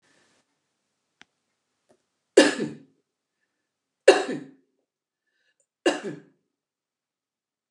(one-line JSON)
{"three_cough_length": "7.7 s", "three_cough_amplitude": 28914, "three_cough_signal_mean_std_ratio": 0.19, "survey_phase": "beta (2021-08-13 to 2022-03-07)", "age": "65+", "gender": "Female", "wearing_mask": "No", "symptom_none": true, "smoker_status": "Ex-smoker", "respiratory_condition_asthma": false, "respiratory_condition_other": false, "recruitment_source": "REACT", "submission_delay": "2 days", "covid_test_result": "Negative", "covid_test_method": "RT-qPCR", "influenza_a_test_result": "Negative", "influenza_b_test_result": "Negative"}